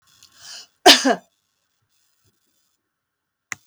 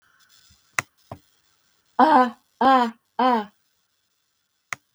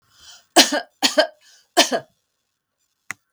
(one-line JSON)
{"cough_length": "3.7 s", "cough_amplitude": 32768, "cough_signal_mean_std_ratio": 0.2, "exhalation_length": "4.9 s", "exhalation_amplitude": 25411, "exhalation_signal_mean_std_ratio": 0.34, "three_cough_length": "3.3 s", "three_cough_amplitude": 32766, "three_cough_signal_mean_std_ratio": 0.3, "survey_phase": "beta (2021-08-13 to 2022-03-07)", "age": "65+", "gender": "Female", "wearing_mask": "No", "symptom_none": true, "smoker_status": "Never smoked", "respiratory_condition_asthma": false, "respiratory_condition_other": false, "recruitment_source": "REACT", "submission_delay": "1 day", "covid_test_result": "Negative", "covid_test_method": "RT-qPCR", "influenza_a_test_result": "Negative", "influenza_b_test_result": "Negative"}